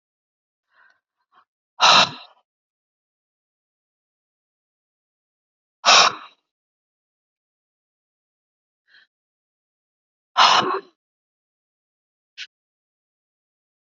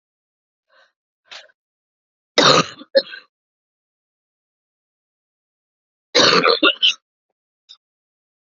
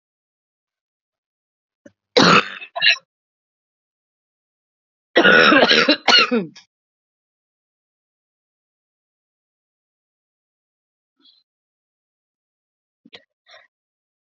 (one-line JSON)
{"exhalation_length": "13.8 s", "exhalation_amplitude": 31405, "exhalation_signal_mean_std_ratio": 0.2, "cough_length": "8.4 s", "cough_amplitude": 32768, "cough_signal_mean_std_ratio": 0.27, "three_cough_length": "14.3 s", "three_cough_amplitude": 32767, "three_cough_signal_mean_std_ratio": 0.26, "survey_phase": "alpha (2021-03-01 to 2021-08-12)", "age": "45-64", "gender": "Female", "wearing_mask": "No", "symptom_cough_any": true, "symptom_headache": true, "smoker_status": "Current smoker (1 to 10 cigarettes per day)", "respiratory_condition_asthma": false, "respiratory_condition_other": true, "recruitment_source": "Test and Trace", "submission_delay": "2 days", "covid_test_result": "Positive", "covid_test_method": "RT-qPCR", "covid_ct_value": 31.8, "covid_ct_gene": "ORF1ab gene", "covid_ct_mean": 33.7, "covid_viral_load": "8.9 copies/ml", "covid_viral_load_category": "Minimal viral load (< 10K copies/ml)"}